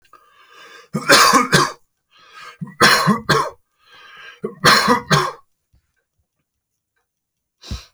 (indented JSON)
{
  "three_cough_length": "7.9 s",
  "three_cough_amplitude": 31327,
  "three_cough_signal_mean_std_ratio": 0.4,
  "survey_phase": "alpha (2021-03-01 to 2021-08-12)",
  "age": "45-64",
  "gender": "Male",
  "wearing_mask": "No",
  "symptom_none": true,
  "smoker_status": "Ex-smoker",
  "respiratory_condition_asthma": false,
  "respiratory_condition_other": false,
  "recruitment_source": "REACT",
  "submission_delay": "1 day",
  "covid_test_result": "Negative",
  "covid_test_method": "RT-qPCR"
}